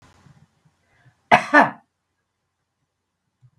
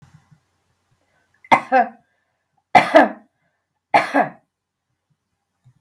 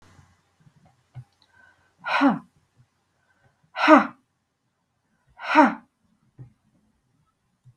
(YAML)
cough_length: 3.6 s
cough_amplitude: 32768
cough_signal_mean_std_ratio: 0.21
three_cough_length: 5.8 s
three_cough_amplitude: 32768
three_cough_signal_mean_std_ratio: 0.27
exhalation_length: 7.8 s
exhalation_amplitude: 28337
exhalation_signal_mean_std_ratio: 0.24
survey_phase: beta (2021-08-13 to 2022-03-07)
age: 45-64
gender: Female
wearing_mask: 'No'
symptom_none: true
smoker_status: Never smoked
respiratory_condition_asthma: false
respiratory_condition_other: false
recruitment_source: REACT
submission_delay: 1 day
covid_test_result: Negative
covid_test_method: RT-qPCR